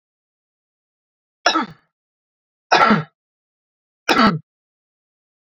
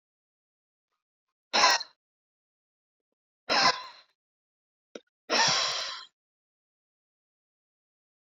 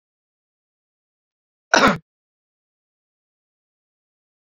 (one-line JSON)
{"three_cough_length": "5.5 s", "three_cough_amplitude": 31094, "three_cough_signal_mean_std_ratio": 0.29, "exhalation_length": "8.4 s", "exhalation_amplitude": 12558, "exhalation_signal_mean_std_ratio": 0.29, "cough_length": "4.5 s", "cough_amplitude": 32768, "cough_signal_mean_std_ratio": 0.16, "survey_phase": "beta (2021-08-13 to 2022-03-07)", "age": "18-44", "gender": "Male", "wearing_mask": "No", "symptom_change_to_sense_of_smell_or_taste": true, "symptom_loss_of_taste": true, "symptom_onset": "5 days", "smoker_status": "Ex-smoker", "respiratory_condition_asthma": false, "respiratory_condition_other": false, "recruitment_source": "Test and Trace", "submission_delay": "2 days", "covid_test_result": "Positive", "covid_test_method": "RT-qPCR", "covid_ct_value": 21.9, "covid_ct_gene": "ORF1ab gene"}